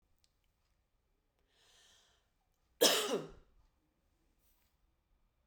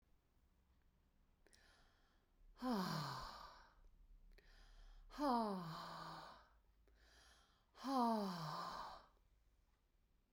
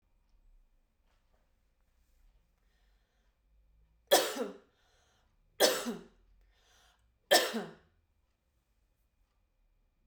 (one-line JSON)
{"cough_length": "5.5 s", "cough_amplitude": 7724, "cough_signal_mean_std_ratio": 0.21, "exhalation_length": "10.3 s", "exhalation_amplitude": 1376, "exhalation_signal_mean_std_ratio": 0.46, "three_cough_length": "10.1 s", "three_cough_amplitude": 9601, "three_cough_signal_mean_std_ratio": 0.23, "survey_phase": "beta (2021-08-13 to 2022-03-07)", "age": "45-64", "gender": "Female", "wearing_mask": "No", "symptom_none": true, "smoker_status": "Never smoked", "respiratory_condition_asthma": false, "respiratory_condition_other": false, "recruitment_source": "REACT", "submission_delay": "1 day", "covid_test_result": "Negative", "covid_test_method": "RT-qPCR"}